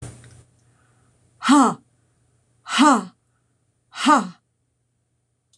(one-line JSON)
{"exhalation_length": "5.6 s", "exhalation_amplitude": 22879, "exhalation_signal_mean_std_ratio": 0.32, "survey_phase": "beta (2021-08-13 to 2022-03-07)", "age": "65+", "gender": "Female", "wearing_mask": "No", "symptom_runny_or_blocked_nose": true, "symptom_sore_throat": true, "symptom_fatigue": true, "smoker_status": "Never smoked", "respiratory_condition_asthma": false, "respiratory_condition_other": false, "recruitment_source": "REACT", "submission_delay": "2 days", "covid_test_result": "Negative", "covid_test_method": "RT-qPCR"}